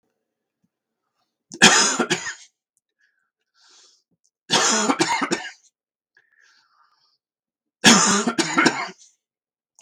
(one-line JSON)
{"three_cough_length": "9.8 s", "three_cough_amplitude": 32768, "three_cough_signal_mean_std_ratio": 0.36, "survey_phase": "beta (2021-08-13 to 2022-03-07)", "age": "65+", "gender": "Male", "wearing_mask": "No", "symptom_cough_any": true, "symptom_onset": "3 days", "smoker_status": "Ex-smoker", "respiratory_condition_asthma": false, "respiratory_condition_other": false, "recruitment_source": "Test and Trace", "submission_delay": "2 days", "covid_test_result": "Positive", "covid_test_method": "RT-qPCR", "covid_ct_value": 16.2, "covid_ct_gene": "ORF1ab gene"}